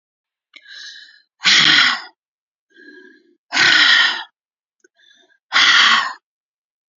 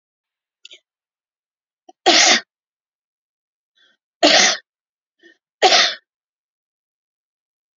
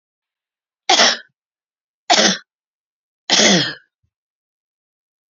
{"exhalation_length": "7.0 s", "exhalation_amplitude": 31103, "exhalation_signal_mean_std_ratio": 0.43, "cough_length": "7.8 s", "cough_amplitude": 32768, "cough_signal_mean_std_ratio": 0.28, "three_cough_length": "5.3 s", "three_cough_amplitude": 32768, "three_cough_signal_mean_std_ratio": 0.33, "survey_phase": "beta (2021-08-13 to 2022-03-07)", "age": "45-64", "gender": "Female", "wearing_mask": "No", "symptom_none": true, "smoker_status": "Ex-smoker", "respiratory_condition_asthma": false, "respiratory_condition_other": false, "recruitment_source": "Test and Trace", "submission_delay": "3 days", "covid_test_result": "Negative", "covid_test_method": "RT-qPCR"}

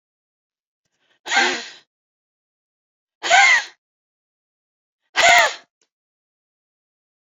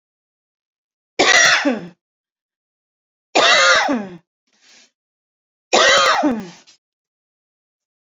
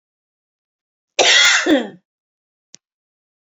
{"exhalation_length": "7.3 s", "exhalation_amplitude": 27497, "exhalation_signal_mean_std_ratio": 0.29, "three_cough_length": "8.1 s", "three_cough_amplitude": 31955, "three_cough_signal_mean_std_ratio": 0.41, "cough_length": "3.5 s", "cough_amplitude": 31222, "cough_signal_mean_std_ratio": 0.35, "survey_phase": "beta (2021-08-13 to 2022-03-07)", "age": "45-64", "gender": "Female", "wearing_mask": "No", "symptom_none": true, "smoker_status": "Ex-smoker", "respiratory_condition_asthma": false, "respiratory_condition_other": false, "recruitment_source": "REACT", "submission_delay": "1 day", "covid_test_result": "Negative", "covid_test_method": "RT-qPCR"}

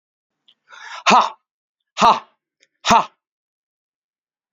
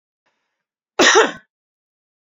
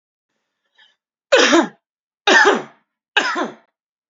{"exhalation_length": "4.5 s", "exhalation_amplitude": 28515, "exhalation_signal_mean_std_ratio": 0.28, "cough_length": "2.2 s", "cough_amplitude": 30069, "cough_signal_mean_std_ratio": 0.3, "three_cough_length": "4.1 s", "three_cough_amplitude": 30970, "three_cough_signal_mean_std_ratio": 0.38, "survey_phase": "beta (2021-08-13 to 2022-03-07)", "age": "45-64", "gender": "Male", "wearing_mask": "No", "symptom_none": true, "smoker_status": "Never smoked", "respiratory_condition_asthma": false, "respiratory_condition_other": false, "recruitment_source": "REACT", "submission_delay": "1 day", "covid_test_result": "Negative", "covid_test_method": "RT-qPCR", "influenza_a_test_result": "Negative", "influenza_b_test_result": "Negative"}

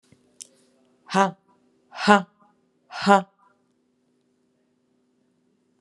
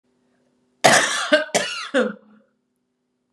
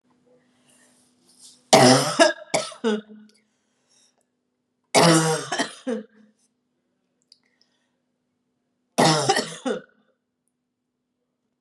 {"exhalation_length": "5.8 s", "exhalation_amplitude": 32760, "exhalation_signal_mean_std_ratio": 0.21, "cough_length": "3.3 s", "cough_amplitude": 32302, "cough_signal_mean_std_ratio": 0.41, "three_cough_length": "11.6 s", "three_cough_amplitude": 30949, "three_cough_signal_mean_std_ratio": 0.33, "survey_phase": "beta (2021-08-13 to 2022-03-07)", "age": "18-44", "gender": "Female", "wearing_mask": "No", "symptom_cough_any": true, "symptom_runny_or_blocked_nose": true, "symptom_onset": "2 days", "smoker_status": "Never smoked", "respiratory_condition_asthma": false, "respiratory_condition_other": false, "recruitment_source": "Test and Trace", "submission_delay": "1 day", "covid_test_result": "Negative", "covid_test_method": "RT-qPCR"}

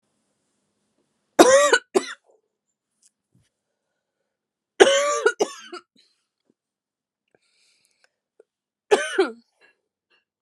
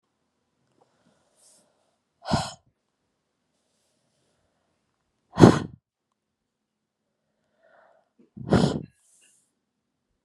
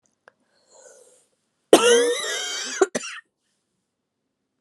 {"three_cough_length": "10.4 s", "three_cough_amplitude": 32768, "three_cough_signal_mean_std_ratio": 0.26, "exhalation_length": "10.2 s", "exhalation_amplitude": 32768, "exhalation_signal_mean_std_ratio": 0.17, "cough_length": "4.6 s", "cough_amplitude": 32767, "cough_signal_mean_std_ratio": 0.33, "survey_phase": "beta (2021-08-13 to 2022-03-07)", "age": "18-44", "gender": "Female", "wearing_mask": "No", "symptom_new_continuous_cough": true, "symptom_runny_or_blocked_nose": true, "symptom_sore_throat": true, "symptom_fatigue": true, "symptom_fever_high_temperature": true, "symptom_headache": true, "symptom_change_to_sense_of_smell_or_taste": true, "symptom_loss_of_taste": true, "symptom_other": true, "symptom_onset": "5 days", "smoker_status": "Ex-smoker", "respiratory_condition_asthma": true, "respiratory_condition_other": false, "recruitment_source": "Test and Trace", "submission_delay": "2 days", "covid_test_result": "Positive", "covid_test_method": "RT-qPCR"}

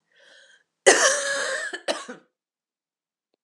{"cough_length": "3.4 s", "cough_amplitude": 29782, "cough_signal_mean_std_ratio": 0.37, "survey_phase": "beta (2021-08-13 to 2022-03-07)", "age": "18-44", "gender": "Female", "wearing_mask": "No", "symptom_cough_any": true, "symptom_new_continuous_cough": true, "symptom_runny_or_blocked_nose": true, "symptom_sore_throat": true, "symptom_abdominal_pain": true, "symptom_fatigue": true, "symptom_headache": true, "symptom_change_to_sense_of_smell_or_taste": true, "symptom_onset": "4 days", "smoker_status": "Never smoked", "respiratory_condition_asthma": false, "respiratory_condition_other": false, "recruitment_source": "Test and Trace", "submission_delay": "2 days", "covid_test_result": "Positive", "covid_test_method": "RT-qPCR", "covid_ct_value": 21.6, "covid_ct_gene": "N gene", "covid_ct_mean": 21.9, "covid_viral_load": "64000 copies/ml", "covid_viral_load_category": "Low viral load (10K-1M copies/ml)"}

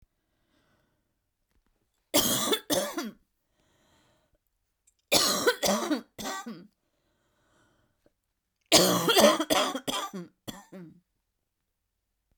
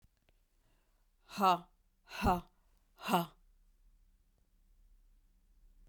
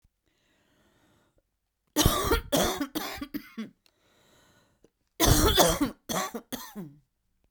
{"three_cough_length": "12.4 s", "three_cough_amplitude": 17091, "three_cough_signal_mean_std_ratio": 0.37, "exhalation_length": "5.9 s", "exhalation_amplitude": 5484, "exhalation_signal_mean_std_ratio": 0.28, "cough_length": "7.5 s", "cough_amplitude": 16742, "cough_signal_mean_std_ratio": 0.41, "survey_phase": "beta (2021-08-13 to 2022-03-07)", "age": "45-64", "gender": "Female", "wearing_mask": "No", "symptom_fatigue": true, "symptom_other": true, "smoker_status": "Never smoked", "respiratory_condition_asthma": true, "respiratory_condition_other": false, "recruitment_source": "Test and Trace", "submission_delay": "1 day", "covid_test_result": "Positive", "covid_test_method": "RT-qPCR", "covid_ct_value": 19.9, "covid_ct_gene": "ORF1ab gene", "covid_ct_mean": 20.8, "covid_viral_load": "160000 copies/ml", "covid_viral_load_category": "Low viral load (10K-1M copies/ml)"}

